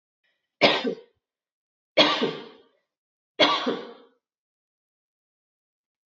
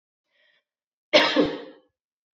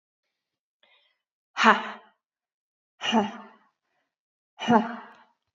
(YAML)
three_cough_length: 6.1 s
three_cough_amplitude: 24913
three_cough_signal_mean_std_ratio: 0.31
cough_length: 2.4 s
cough_amplitude: 22131
cough_signal_mean_std_ratio: 0.32
exhalation_length: 5.5 s
exhalation_amplitude: 27011
exhalation_signal_mean_std_ratio: 0.28
survey_phase: beta (2021-08-13 to 2022-03-07)
age: 45-64
gender: Female
wearing_mask: 'No'
symptom_none: true
smoker_status: Never smoked
respiratory_condition_asthma: false
respiratory_condition_other: false
recruitment_source: REACT
submission_delay: 2 days
covid_test_result: Negative
covid_test_method: RT-qPCR
influenza_a_test_result: Negative
influenza_b_test_result: Negative